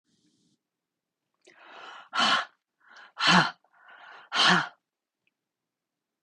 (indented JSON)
{
  "exhalation_length": "6.2 s",
  "exhalation_amplitude": 17199,
  "exhalation_signal_mean_std_ratio": 0.32,
  "survey_phase": "beta (2021-08-13 to 2022-03-07)",
  "age": "45-64",
  "gender": "Female",
  "wearing_mask": "No",
  "symptom_none": true,
  "smoker_status": "Ex-smoker",
  "respiratory_condition_asthma": false,
  "respiratory_condition_other": false,
  "recruitment_source": "REACT",
  "submission_delay": "3 days",
  "covid_test_result": "Negative",
  "covid_test_method": "RT-qPCR",
  "influenza_a_test_result": "Negative",
  "influenza_b_test_result": "Negative"
}